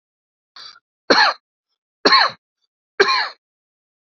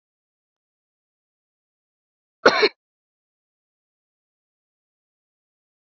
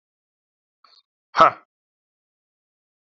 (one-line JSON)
{"three_cough_length": "4.0 s", "three_cough_amplitude": 29627, "three_cough_signal_mean_std_ratio": 0.34, "cough_length": "6.0 s", "cough_amplitude": 28468, "cough_signal_mean_std_ratio": 0.13, "exhalation_length": "3.2 s", "exhalation_amplitude": 27267, "exhalation_signal_mean_std_ratio": 0.15, "survey_phase": "alpha (2021-03-01 to 2021-08-12)", "age": "45-64", "gender": "Male", "wearing_mask": "No", "symptom_none": true, "smoker_status": "Ex-smoker", "respiratory_condition_asthma": false, "respiratory_condition_other": false, "recruitment_source": "REACT", "submission_delay": "1 day", "covid_test_result": "Negative", "covid_test_method": "RT-qPCR"}